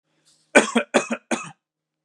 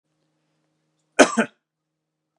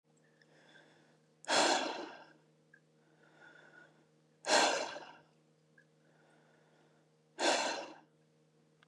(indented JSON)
{
  "three_cough_length": "2.0 s",
  "three_cough_amplitude": 32767,
  "three_cough_signal_mean_std_ratio": 0.33,
  "cough_length": "2.4 s",
  "cough_amplitude": 32767,
  "cough_signal_mean_std_ratio": 0.19,
  "exhalation_length": "8.9 s",
  "exhalation_amplitude": 5899,
  "exhalation_signal_mean_std_ratio": 0.34,
  "survey_phase": "beta (2021-08-13 to 2022-03-07)",
  "age": "18-44",
  "gender": "Male",
  "wearing_mask": "No",
  "symptom_none": true,
  "smoker_status": "Never smoked",
  "respiratory_condition_asthma": false,
  "respiratory_condition_other": false,
  "recruitment_source": "REACT",
  "submission_delay": "2 days",
  "covid_test_result": "Negative",
  "covid_test_method": "RT-qPCR",
  "influenza_a_test_result": "Negative",
  "influenza_b_test_result": "Negative"
}